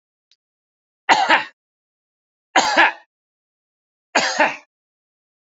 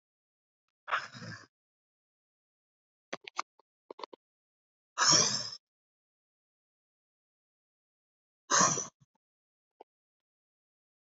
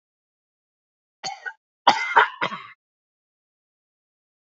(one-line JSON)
{"three_cough_length": "5.5 s", "three_cough_amplitude": 29631, "three_cough_signal_mean_std_ratio": 0.32, "exhalation_length": "11.1 s", "exhalation_amplitude": 10902, "exhalation_signal_mean_std_ratio": 0.23, "cough_length": "4.4 s", "cough_amplitude": 27375, "cough_signal_mean_std_ratio": 0.24, "survey_phase": "beta (2021-08-13 to 2022-03-07)", "age": "45-64", "gender": "Male", "wearing_mask": "No", "symptom_none": true, "smoker_status": "Never smoked", "respiratory_condition_asthma": false, "respiratory_condition_other": false, "recruitment_source": "REACT", "submission_delay": "4 days", "covid_test_result": "Negative", "covid_test_method": "RT-qPCR"}